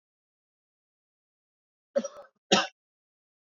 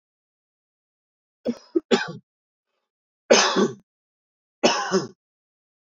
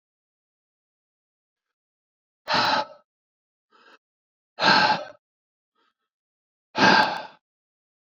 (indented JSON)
{
  "cough_length": "3.6 s",
  "cough_amplitude": 15501,
  "cough_signal_mean_std_ratio": 0.19,
  "three_cough_length": "5.9 s",
  "three_cough_amplitude": 25889,
  "three_cough_signal_mean_std_ratio": 0.31,
  "exhalation_length": "8.1 s",
  "exhalation_amplitude": 19530,
  "exhalation_signal_mean_std_ratio": 0.3,
  "survey_phase": "beta (2021-08-13 to 2022-03-07)",
  "age": "45-64",
  "gender": "Male",
  "wearing_mask": "No",
  "symptom_none": true,
  "smoker_status": "Ex-smoker",
  "respiratory_condition_asthma": false,
  "respiratory_condition_other": false,
  "recruitment_source": "REACT",
  "submission_delay": "2 days",
  "covid_test_result": "Negative",
  "covid_test_method": "RT-qPCR",
  "influenza_a_test_result": "Negative",
  "influenza_b_test_result": "Negative"
}